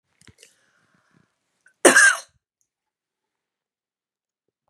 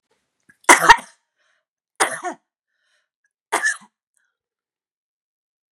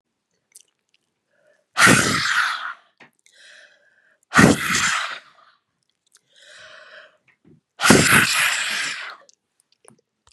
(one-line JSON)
{"cough_length": "4.7 s", "cough_amplitude": 32767, "cough_signal_mean_std_ratio": 0.2, "three_cough_length": "5.7 s", "three_cough_amplitude": 32768, "three_cough_signal_mean_std_ratio": 0.21, "exhalation_length": "10.3 s", "exhalation_amplitude": 32768, "exhalation_signal_mean_std_ratio": 0.39, "survey_phase": "beta (2021-08-13 to 2022-03-07)", "age": "65+", "gender": "Female", "wearing_mask": "No", "symptom_loss_of_taste": true, "symptom_other": true, "smoker_status": "Ex-smoker", "respiratory_condition_asthma": false, "respiratory_condition_other": true, "recruitment_source": "REACT", "submission_delay": "1 day", "covid_test_result": "Negative", "covid_test_method": "RT-qPCR", "influenza_a_test_result": "Negative", "influenza_b_test_result": "Negative"}